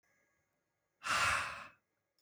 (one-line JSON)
{"exhalation_length": "2.2 s", "exhalation_amplitude": 3224, "exhalation_signal_mean_std_ratio": 0.4, "survey_phase": "alpha (2021-03-01 to 2021-08-12)", "age": "18-44", "gender": "Male", "wearing_mask": "No", "symptom_none": true, "smoker_status": "Never smoked", "respiratory_condition_asthma": true, "respiratory_condition_other": false, "recruitment_source": "REACT", "submission_delay": "1 day", "covid_test_result": "Negative", "covid_test_method": "RT-qPCR"}